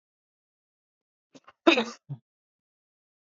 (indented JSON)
{
  "cough_length": "3.2 s",
  "cough_amplitude": 18967,
  "cough_signal_mean_std_ratio": 0.18,
  "survey_phase": "beta (2021-08-13 to 2022-03-07)",
  "age": "45-64",
  "gender": "Male",
  "wearing_mask": "No",
  "symptom_cough_any": true,
  "symptom_onset": "5 days",
  "smoker_status": "Ex-smoker",
  "respiratory_condition_asthma": false,
  "respiratory_condition_other": false,
  "recruitment_source": "Test and Trace",
  "submission_delay": "2 days",
  "covid_test_result": "Positive",
  "covid_test_method": "RT-qPCR",
  "covid_ct_value": 30.8,
  "covid_ct_gene": "ORF1ab gene"
}